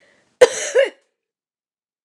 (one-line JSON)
{"three_cough_length": "2.0 s", "three_cough_amplitude": 29204, "three_cough_signal_mean_std_ratio": 0.28, "survey_phase": "beta (2021-08-13 to 2022-03-07)", "age": "45-64", "gender": "Female", "wearing_mask": "No", "symptom_none": true, "smoker_status": "Never smoked", "respiratory_condition_asthma": false, "respiratory_condition_other": false, "recruitment_source": "REACT", "submission_delay": "1 day", "covid_test_result": "Negative", "covid_test_method": "RT-qPCR", "influenza_a_test_result": "Unknown/Void", "influenza_b_test_result": "Unknown/Void"}